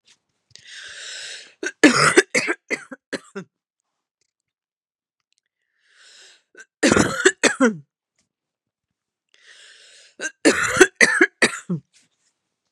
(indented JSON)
{
  "three_cough_length": "12.7 s",
  "three_cough_amplitude": 32768,
  "three_cough_signal_mean_std_ratio": 0.32,
  "survey_phase": "beta (2021-08-13 to 2022-03-07)",
  "age": "18-44",
  "gender": "Female",
  "wearing_mask": "No",
  "symptom_cough_any": true,
  "symptom_runny_or_blocked_nose": true,
  "symptom_sore_throat": true,
  "symptom_fatigue": true,
  "symptom_fever_high_temperature": true,
  "symptom_headache": true,
  "symptom_change_to_sense_of_smell_or_taste": true,
  "smoker_status": "Ex-smoker",
  "respiratory_condition_asthma": false,
  "respiratory_condition_other": false,
  "recruitment_source": "Test and Trace",
  "submission_delay": "2 days",
  "covid_test_result": "Positive",
  "covid_test_method": "RT-qPCR",
  "covid_ct_value": 23.3,
  "covid_ct_gene": "ORF1ab gene"
}